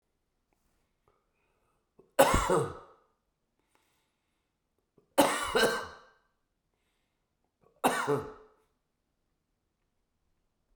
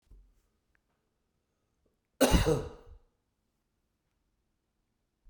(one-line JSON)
{"three_cough_length": "10.8 s", "three_cough_amplitude": 13950, "three_cough_signal_mean_std_ratio": 0.28, "cough_length": "5.3 s", "cough_amplitude": 10385, "cough_signal_mean_std_ratio": 0.23, "survey_phase": "beta (2021-08-13 to 2022-03-07)", "age": "65+", "gender": "Male", "wearing_mask": "No", "symptom_cough_any": true, "symptom_runny_or_blocked_nose": true, "symptom_sore_throat": true, "symptom_fatigue": true, "symptom_change_to_sense_of_smell_or_taste": true, "symptom_loss_of_taste": true, "symptom_onset": "3 days", "smoker_status": "Never smoked", "respiratory_condition_asthma": false, "respiratory_condition_other": true, "recruitment_source": "Test and Trace", "submission_delay": "3 days", "covid_test_result": "Positive", "covid_test_method": "RT-qPCR"}